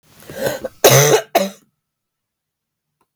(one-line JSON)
{"cough_length": "3.2 s", "cough_amplitude": 32768, "cough_signal_mean_std_ratio": 0.37, "survey_phase": "beta (2021-08-13 to 2022-03-07)", "age": "45-64", "gender": "Female", "wearing_mask": "No", "symptom_cough_any": true, "symptom_runny_or_blocked_nose": true, "symptom_diarrhoea": true, "symptom_fatigue": true, "symptom_fever_high_temperature": true, "symptom_change_to_sense_of_smell_or_taste": true, "symptom_loss_of_taste": true, "symptom_onset": "2 days", "smoker_status": "Never smoked", "respiratory_condition_asthma": false, "respiratory_condition_other": false, "recruitment_source": "Test and Trace", "submission_delay": "1 day", "covid_test_result": "Positive", "covid_test_method": "RT-qPCR", "covid_ct_value": 18.0, "covid_ct_gene": "ORF1ab gene", "covid_ct_mean": 18.6, "covid_viral_load": "820000 copies/ml", "covid_viral_load_category": "Low viral load (10K-1M copies/ml)"}